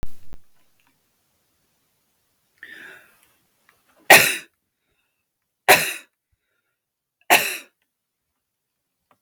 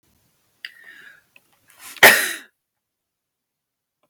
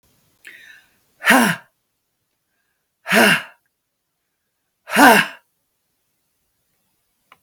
three_cough_length: 9.2 s
three_cough_amplitude: 32768
three_cough_signal_mean_std_ratio: 0.23
cough_length: 4.1 s
cough_amplitude: 32768
cough_signal_mean_std_ratio: 0.2
exhalation_length: 7.4 s
exhalation_amplitude: 32768
exhalation_signal_mean_std_ratio: 0.28
survey_phase: beta (2021-08-13 to 2022-03-07)
age: 45-64
gender: Female
wearing_mask: 'No'
symptom_none: true
smoker_status: Never smoked
respiratory_condition_asthma: false
respiratory_condition_other: false
recruitment_source: REACT
submission_delay: 1 day
covid_test_result: Negative
covid_test_method: RT-qPCR
influenza_a_test_result: Negative
influenza_b_test_result: Negative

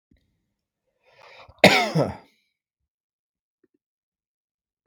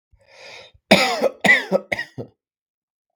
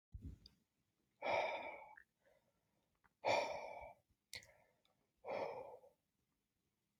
cough_length: 4.9 s
cough_amplitude: 32768
cough_signal_mean_std_ratio: 0.21
three_cough_length: 3.2 s
three_cough_amplitude: 32768
three_cough_signal_mean_std_ratio: 0.37
exhalation_length: 7.0 s
exhalation_amplitude: 1794
exhalation_signal_mean_std_ratio: 0.38
survey_phase: beta (2021-08-13 to 2022-03-07)
age: 18-44
gender: Male
wearing_mask: 'No'
symptom_none: true
smoker_status: Never smoked
respiratory_condition_asthma: false
respiratory_condition_other: false
recruitment_source: REACT
submission_delay: 3 days
covid_test_result: Negative
covid_test_method: RT-qPCR
influenza_a_test_result: Negative
influenza_b_test_result: Negative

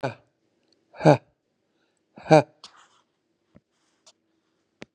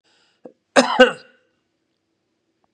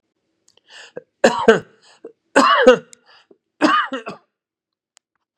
exhalation_length: 4.9 s
exhalation_amplitude: 31113
exhalation_signal_mean_std_ratio: 0.17
cough_length: 2.7 s
cough_amplitude: 32767
cough_signal_mean_std_ratio: 0.24
three_cough_length: 5.4 s
three_cough_amplitude: 32768
three_cough_signal_mean_std_ratio: 0.34
survey_phase: beta (2021-08-13 to 2022-03-07)
age: 45-64
gender: Male
wearing_mask: 'No'
symptom_fatigue: true
symptom_onset: 12 days
smoker_status: Never smoked
respiratory_condition_asthma: false
respiratory_condition_other: false
recruitment_source: REACT
submission_delay: 2 days
covid_test_result: Negative
covid_test_method: RT-qPCR
influenza_a_test_result: Negative
influenza_b_test_result: Negative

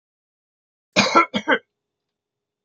cough_length: 2.6 s
cough_amplitude: 30658
cough_signal_mean_std_ratio: 0.3
survey_phase: beta (2021-08-13 to 2022-03-07)
age: 65+
gender: Female
wearing_mask: 'No'
symptom_none: true
smoker_status: Never smoked
respiratory_condition_asthma: false
respiratory_condition_other: false
recruitment_source: REACT
submission_delay: 3 days
covid_test_result: Negative
covid_test_method: RT-qPCR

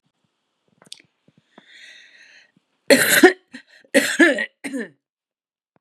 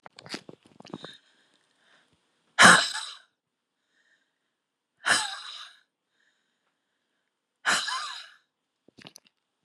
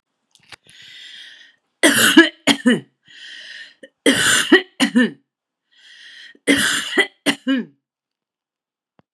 cough_length: 5.8 s
cough_amplitude: 32767
cough_signal_mean_std_ratio: 0.3
exhalation_length: 9.6 s
exhalation_amplitude: 29282
exhalation_signal_mean_std_ratio: 0.22
three_cough_length: 9.1 s
three_cough_amplitude: 32768
three_cough_signal_mean_std_ratio: 0.39
survey_phase: beta (2021-08-13 to 2022-03-07)
age: 65+
gender: Female
wearing_mask: 'No'
symptom_none: true
symptom_onset: 8 days
smoker_status: Ex-smoker
respiratory_condition_asthma: false
respiratory_condition_other: false
recruitment_source: REACT
submission_delay: 3 days
covid_test_result: Positive
covid_test_method: RT-qPCR
covid_ct_value: 26.0
covid_ct_gene: E gene
influenza_a_test_result: Negative
influenza_b_test_result: Negative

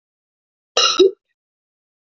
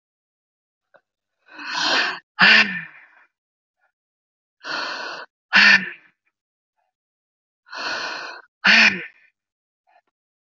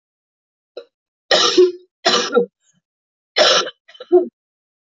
cough_length: 2.1 s
cough_amplitude: 25611
cough_signal_mean_std_ratio: 0.3
exhalation_length: 10.6 s
exhalation_amplitude: 30104
exhalation_signal_mean_std_ratio: 0.33
three_cough_length: 4.9 s
three_cough_amplitude: 28726
three_cough_signal_mean_std_ratio: 0.4
survey_phase: beta (2021-08-13 to 2022-03-07)
age: 45-64
gender: Female
wearing_mask: 'No'
symptom_cough_any: true
symptom_runny_or_blocked_nose: true
symptom_shortness_of_breath: true
symptom_sore_throat: true
symptom_fatigue: true
symptom_headache: true
symptom_change_to_sense_of_smell_or_taste: true
symptom_loss_of_taste: true
symptom_onset: 4 days
smoker_status: Current smoker (1 to 10 cigarettes per day)
respiratory_condition_asthma: false
respiratory_condition_other: false
recruitment_source: Test and Trace
submission_delay: 2 days
covid_test_result: Positive
covid_test_method: RT-qPCR
covid_ct_value: 19.3
covid_ct_gene: ORF1ab gene
covid_ct_mean: 19.8
covid_viral_load: 330000 copies/ml
covid_viral_load_category: Low viral load (10K-1M copies/ml)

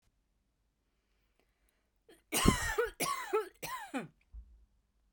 cough_length: 5.1 s
cough_amplitude: 8873
cough_signal_mean_std_ratio: 0.37
survey_phase: beta (2021-08-13 to 2022-03-07)
age: 45-64
gender: Female
wearing_mask: 'No'
symptom_none: true
smoker_status: Never smoked
respiratory_condition_asthma: false
respiratory_condition_other: false
recruitment_source: REACT
submission_delay: 1 day
covid_test_result: Negative
covid_test_method: RT-qPCR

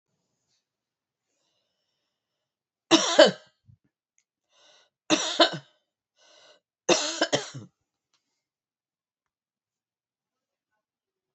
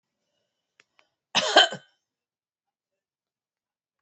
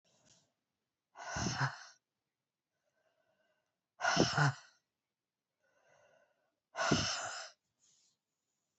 three_cough_length: 11.3 s
three_cough_amplitude: 28813
three_cough_signal_mean_std_ratio: 0.21
cough_length: 4.0 s
cough_amplitude: 25237
cough_signal_mean_std_ratio: 0.2
exhalation_length: 8.8 s
exhalation_amplitude: 6104
exhalation_signal_mean_std_ratio: 0.33
survey_phase: alpha (2021-03-01 to 2021-08-12)
age: 65+
gender: Female
wearing_mask: 'No'
symptom_cough_any: true
symptom_headache: true
symptom_change_to_sense_of_smell_or_taste: true
symptom_onset: 3 days
smoker_status: Never smoked
respiratory_condition_asthma: false
respiratory_condition_other: false
recruitment_source: Test and Trace
submission_delay: 2 days
covid_test_result: Positive
covid_test_method: RT-qPCR
covid_ct_value: 24.8
covid_ct_gene: ORF1ab gene
covid_ct_mean: 25.7
covid_viral_load: 3700 copies/ml
covid_viral_load_category: Minimal viral load (< 10K copies/ml)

